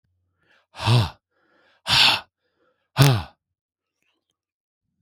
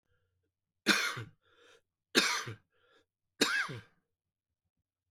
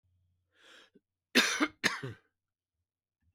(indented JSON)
{
  "exhalation_length": "5.0 s",
  "exhalation_amplitude": 32768,
  "exhalation_signal_mean_std_ratio": 0.33,
  "three_cough_length": "5.1 s",
  "three_cough_amplitude": 10442,
  "three_cough_signal_mean_std_ratio": 0.33,
  "cough_length": "3.3 s",
  "cough_amplitude": 11420,
  "cough_signal_mean_std_ratio": 0.28,
  "survey_phase": "beta (2021-08-13 to 2022-03-07)",
  "age": "65+",
  "gender": "Male",
  "wearing_mask": "No",
  "symptom_runny_or_blocked_nose": true,
  "smoker_status": "Ex-smoker",
  "respiratory_condition_asthma": false,
  "respiratory_condition_other": false,
  "recruitment_source": "REACT",
  "submission_delay": "1 day",
  "covid_test_result": "Negative",
  "covid_test_method": "RT-qPCR",
  "influenza_a_test_result": "Negative",
  "influenza_b_test_result": "Negative"
}